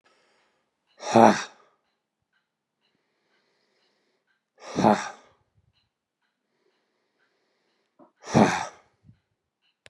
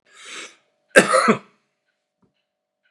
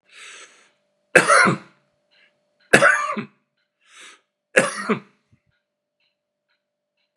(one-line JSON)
{"exhalation_length": "9.9 s", "exhalation_amplitude": 28433, "exhalation_signal_mean_std_ratio": 0.22, "cough_length": "2.9 s", "cough_amplitude": 32768, "cough_signal_mean_std_ratio": 0.28, "three_cough_length": "7.2 s", "three_cough_amplitude": 32768, "three_cough_signal_mean_std_ratio": 0.29, "survey_phase": "beta (2021-08-13 to 2022-03-07)", "age": "65+", "gender": "Male", "wearing_mask": "No", "symptom_none": true, "smoker_status": "Ex-smoker", "respiratory_condition_asthma": false, "respiratory_condition_other": false, "recruitment_source": "REACT", "submission_delay": "2 days", "covid_test_result": "Negative", "covid_test_method": "RT-qPCR"}